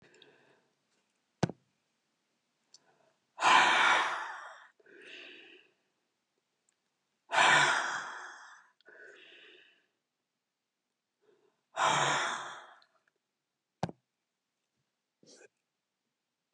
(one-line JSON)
{"exhalation_length": "16.5 s", "exhalation_amplitude": 10099, "exhalation_signal_mean_std_ratio": 0.31, "survey_phase": "beta (2021-08-13 to 2022-03-07)", "age": "65+", "gender": "Female", "wearing_mask": "No", "symptom_cough_any": true, "smoker_status": "Ex-smoker", "respiratory_condition_asthma": false, "respiratory_condition_other": true, "recruitment_source": "REACT", "submission_delay": "2 days", "covid_test_result": "Negative", "covid_test_method": "RT-qPCR", "influenza_a_test_result": "Negative", "influenza_b_test_result": "Negative"}